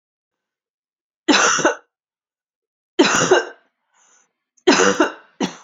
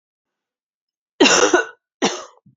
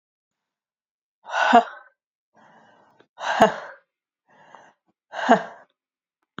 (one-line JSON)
{"three_cough_length": "5.6 s", "three_cough_amplitude": 31830, "three_cough_signal_mean_std_ratio": 0.39, "cough_length": "2.6 s", "cough_amplitude": 29361, "cough_signal_mean_std_ratio": 0.36, "exhalation_length": "6.4 s", "exhalation_amplitude": 32767, "exhalation_signal_mean_std_ratio": 0.27, "survey_phase": "beta (2021-08-13 to 2022-03-07)", "age": "18-44", "gender": "Female", "wearing_mask": "No", "symptom_cough_any": true, "symptom_runny_or_blocked_nose": true, "symptom_fatigue": true, "symptom_headache": true, "symptom_other": true, "symptom_onset": "3 days", "smoker_status": "Never smoked", "respiratory_condition_asthma": false, "respiratory_condition_other": false, "recruitment_source": "Test and Trace", "submission_delay": "1 day", "covid_test_result": "Positive", "covid_test_method": "RT-qPCR", "covid_ct_value": 21.6, "covid_ct_gene": "ORF1ab gene"}